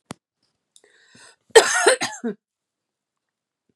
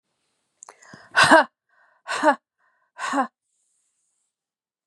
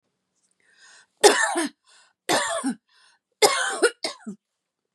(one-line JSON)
{"cough_length": "3.8 s", "cough_amplitude": 32768, "cough_signal_mean_std_ratio": 0.26, "exhalation_length": "4.9 s", "exhalation_amplitude": 30679, "exhalation_signal_mean_std_ratio": 0.27, "three_cough_length": "4.9 s", "three_cough_amplitude": 32760, "three_cough_signal_mean_std_ratio": 0.38, "survey_phase": "beta (2021-08-13 to 2022-03-07)", "age": "45-64", "gender": "Female", "wearing_mask": "No", "symptom_cough_any": true, "symptom_fatigue": true, "symptom_change_to_sense_of_smell_or_taste": true, "symptom_onset": "12 days", "smoker_status": "Never smoked", "respiratory_condition_asthma": false, "respiratory_condition_other": false, "recruitment_source": "REACT", "submission_delay": "6 days", "covid_test_result": "Negative", "covid_test_method": "RT-qPCR", "influenza_a_test_result": "Negative", "influenza_b_test_result": "Negative"}